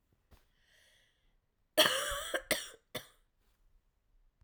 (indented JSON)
{
  "cough_length": "4.4 s",
  "cough_amplitude": 8107,
  "cough_signal_mean_std_ratio": 0.29,
  "survey_phase": "alpha (2021-03-01 to 2021-08-12)",
  "age": "18-44",
  "gender": "Female",
  "wearing_mask": "No",
  "symptom_cough_any": true,
  "symptom_new_continuous_cough": true,
  "symptom_shortness_of_breath": true,
  "symptom_fatigue": true,
  "symptom_headache": true,
  "smoker_status": "Never smoked",
  "respiratory_condition_asthma": false,
  "respiratory_condition_other": false,
  "recruitment_source": "Test and Trace",
  "submission_delay": "2 days",
  "covid_test_result": "Positive",
  "covid_test_method": "RT-qPCR",
  "covid_ct_value": 24.0,
  "covid_ct_gene": "ORF1ab gene",
  "covid_ct_mean": 24.5,
  "covid_viral_load": "9200 copies/ml",
  "covid_viral_load_category": "Minimal viral load (< 10K copies/ml)"
}